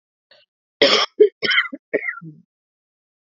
{"cough_length": "3.3 s", "cough_amplitude": 32768, "cough_signal_mean_std_ratio": 0.35, "survey_phase": "beta (2021-08-13 to 2022-03-07)", "age": "18-44", "gender": "Female", "wearing_mask": "No", "symptom_cough_any": true, "symptom_runny_or_blocked_nose": true, "symptom_sore_throat": true, "symptom_abdominal_pain": true, "symptom_fatigue": true, "symptom_fever_high_temperature": true, "symptom_headache": true, "symptom_onset": "2 days", "smoker_status": "Never smoked", "respiratory_condition_asthma": false, "respiratory_condition_other": false, "recruitment_source": "Test and Trace", "submission_delay": "1 day", "covid_test_result": "Positive", "covid_test_method": "RT-qPCR", "covid_ct_value": 24.1, "covid_ct_gene": "ORF1ab gene", "covid_ct_mean": 24.1, "covid_viral_load": "13000 copies/ml", "covid_viral_load_category": "Low viral load (10K-1M copies/ml)"}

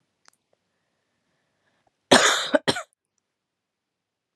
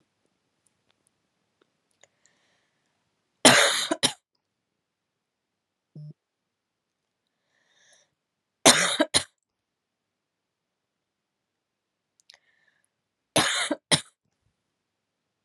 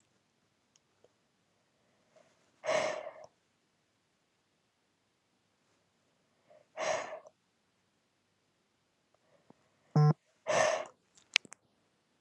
{"cough_length": "4.4 s", "cough_amplitude": 31063, "cough_signal_mean_std_ratio": 0.24, "three_cough_length": "15.4 s", "three_cough_amplitude": 31053, "three_cough_signal_mean_std_ratio": 0.21, "exhalation_length": "12.2 s", "exhalation_amplitude": 26406, "exhalation_signal_mean_std_ratio": 0.25, "survey_phase": "alpha (2021-03-01 to 2021-08-12)", "age": "18-44", "gender": "Female", "wearing_mask": "No", "symptom_cough_any": true, "symptom_fever_high_temperature": true, "symptom_headache": true, "symptom_onset": "3 days", "smoker_status": "Ex-smoker", "respiratory_condition_asthma": false, "respiratory_condition_other": false, "recruitment_source": "Test and Trace", "submission_delay": "2 days", "covid_test_result": "Positive", "covid_test_method": "RT-qPCR"}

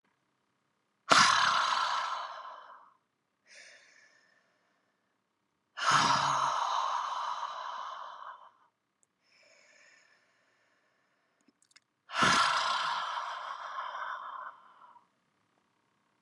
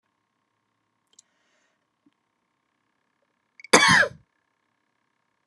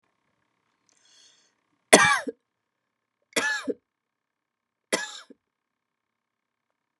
{"exhalation_length": "16.2 s", "exhalation_amplitude": 17899, "exhalation_signal_mean_std_ratio": 0.44, "cough_length": "5.5 s", "cough_amplitude": 31013, "cough_signal_mean_std_ratio": 0.2, "three_cough_length": "7.0 s", "three_cough_amplitude": 32767, "three_cough_signal_mean_std_ratio": 0.21, "survey_phase": "beta (2021-08-13 to 2022-03-07)", "age": "45-64", "gender": "Female", "wearing_mask": "No", "symptom_none": true, "smoker_status": "Never smoked", "respiratory_condition_asthma": true, "respiratory_condition_other": false, "recruitment_source": "REACT", "submission_delay": "1 day", "covid_test_result": "Negative", "covid_test_method": "RT-qPCR", "influenza_a_test_result": "Negative", "influenza_b_test_result": "Negative"}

